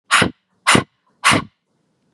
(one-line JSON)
{"exhalation_length": "2.1 s", "exhalation_amplitude": 32768, "exhalation_signal_mean_std_ratio": 0.39, "survey_phase": "beta (2021-08-13 to 2022-03-07)", "age": "18-44", "gender": "Female", "wearing_mask": "No", "symptom_none": true, "smoker_status": "Current smoker (1 to 10 cigarettes per day)", "respiratory_condition_asthma": false, "respiratory_condition_other": false, "recruitment_source": "REACT", "submission_delay": "2 days", "covid_test_result": "Negative", "covid_test_method": "RT-qPCR", "influenza_a_test_result": "Negative", "influenza_b_test_result": "Negative"}